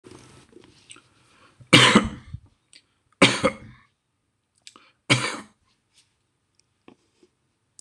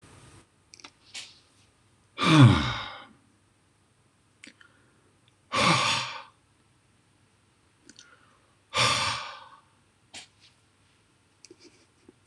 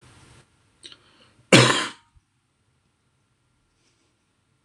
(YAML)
three_cough_length: 7.8 s
three_cough_amplitude: 26028
three_cough_signal_mean_std_ratio: 0.24
exhalation_length: 12.3 s
exhalation_amplitude: 20557
exhalation_signal_mean_std_ratio: 0.28
cough_length: 4.6 s
cough_amplitude: 26028
cough_signal_mean_std_ratio: 0.2
survey_phase: beta (2021-08-13 to 2022-03-07)
age: 65+
gender: Male
wearing_mask: 'No'
symptom_sore_throat: true
smoker_status: Current smoker (1 to 10 cigarettes per day)
respiratory_condition_asthma: false
respiratory_condition_other: false
recruitment_source: REACT
submission_delay: 2 days
covid_test_result: Negative
covid_test_method: RT-qPCR